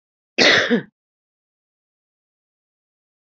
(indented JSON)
{
  "cough_length": "3.3 s",
  "cough_amplitude": 28621,
  "cough_signal_mean_std_ratio": 0.27,
  "survey_phase": "beta (2021-08-13 to 2022-03-07)",
  "age": "45-64",
  "gender": "Female",
  "wearing_mask": "No",
  "symptom_headache": true,
  "symptom_onset": "12 days",
  "smoker_status": "Ex-smoker",
  "respiratory_condition_asthma": false,
  "respiratory_condition_other": false,
  "recruitment_source": "REACT",
  "submission_delay": "2 days",
  "covid_test_result": "Negative",
  "covid_test_method": "RT-qPCR",
  "influenza_a_test_result": "Negative",
  "influenza_b_test_result": "Negative"
}